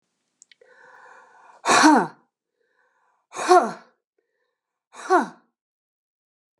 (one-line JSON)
{"exhalation_length": "6.6 s", "exhalation_amplitude": 27734, "exhalation_signal_mean_std_ratio": 0.28, "survey_phase": "beta (2021-08-13 to 2022-03-07)", "age": "65+", "gender": "Female", "wearing_mask": "No", "symptom_runny_or_blocked_nose": true, "smoker_status": "Ex-smoker", "respiratory_condition_asthma": false, "respiratory_condition_other": false, "recruitment_source": "REACT", "submission_delay": "3 days", "covid_test_result": "Negative", "covid_test_method": "RT-qPCR", "influenza_a_test_result": "Negative", "influenza_b_test_result": "Negative"}